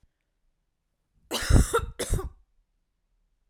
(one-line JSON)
{"cough_length": "3.5 s", "cough_amplitude": 22785, "cough_signal_mean_std_ratio": 0.31, "survey_phase": "alpha (2021-03-01 to 2021-08-12)", "age": "18-44", "gender": "Female", "wearing_mask": "No", "symptom_none": true, "smoker_status": "Never smoked", "respiratory_condition_asthma": true, "respiratory_condition_other": false, "recruitment_source": "REACT", "submission_delay": "1 day", "covid_test_result": "Negative", "covid_test_method": "RT-qPCR"}